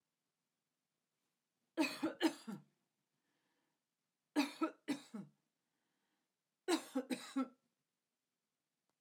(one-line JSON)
{"three_cough_length": "9.0 s", "three_cough_amplitude": 2868, "three_cough_signal_mean_std_ratio": 0.3, "survey_phase": "alpha (2021-03-01 to 2021-08-12)", "age": "65+", "gender": "Female", "wearing_mask": "No", "symptom_none": true, "smoker_status": "Never smoked", "respiratory_condition_asthma": false, "respiratory_condition_other": false, "recruitment_source": "REACT", "submission_delay": "1 day", "covid_test_result": "Negative", "covid_test_method": "RT-qPCR"}